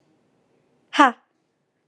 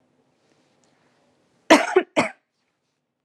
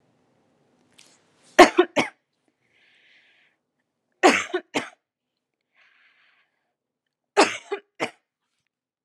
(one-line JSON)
{"exhalation_length": "1.9 s", "exhalation_amplitude": 31884, "exhalation_signal_mean_std_ratio": 0.2, "cough_length": "3.2 s", "cough_amplitude": 32767, "cough_signal_mean_std_ratio": 0.23, "three_cough_length": "9.0 s", "three_cough_amplitude": 32768, "three_cough_signal_mean_std_ratio": 0.2, "survey_phase": "alpha (2021-03-01 to 2021-08-12)", "age": "18-44", "gender": "Female", "wearing_mask": "Yes", "symptom_none": true, "smoker_status": "Never smoked", "respiratory_condition_asthma": true, "respiratory_condition_other": false, "recruitment_source": "Test and Trace", "submission_delay": "0 days", "covid_test_result": "Negative", "covid_test_method": "LFT"}